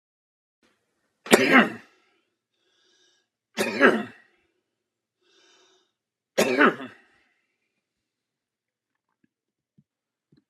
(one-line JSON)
{"three_cough_length": "10.5 s", "three_cough_amplitude": 32609, "three_cough_signal_mean_std_ratio": 0.24, "survey_phase": "alpha (2021-03-01 to 2021-08-12)", "age": "45-64", "gender": "Male", "wearing_mask": "No", "symptom_none": true, "smoker_status": "Never smoked", "respiratory_condition_asthma": true, "respiratory_condition_other": false, "recruitment_source": "REACT", "submission_delay": "3 days", "covid_test_result": "Negative", "covid_test_method": "RT-qPCR"}